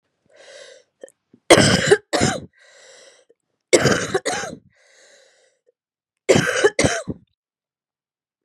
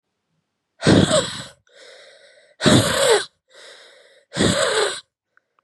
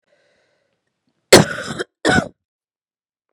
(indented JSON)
{
  "three_cough_length": "8.4 s",
  "three_cough_amplitude": 32768,
  "three_cough_signal_mean_std_ratio": 0.35,
  "exhalation_length": "5.6 s",
  "exhalation_amplitude": 27811,
  "exhalation_signal_mean_std_ratio": 0.45,
  "cough_length": "3.3 s",
  "cough_amplitude": 32768,
  "cough_signal_mean_std_ratio": 0.25,
  "survey_phase": "beta (2021-08-13 to 2022-03-07)",
  "age": "18-44",
  "gender": "Female",
  "wearing_mask": "No",
  "symptom_cough_any": true,
  "symptom_new_continuous_cough": true,
  "symptom_runny_or_blocked_nose": true,
  "symptom_sore_throat": true,
  "symptom_fatigue": true,
  "symptom_headache": true,
  "symptom_change_to_sense_of_smell_or_taste": true,
  "symptom_loss_of_taste": true,
  "symptom_onset": "8 days",
  "smoker_status": "Never smoked",
  "respiratory_condition_asthma": false,
  "respiratory_condition_other": false,
  "recruitment_source": "Test and Trace",
  "submission_delay": "2 days",
  "covid_test_result": "Positive",
  "covid_test_method": "RT-qPCR",
  "covid_ct_value": 21.3,
  "covid_ct_gene": "ORF1ab gene"
}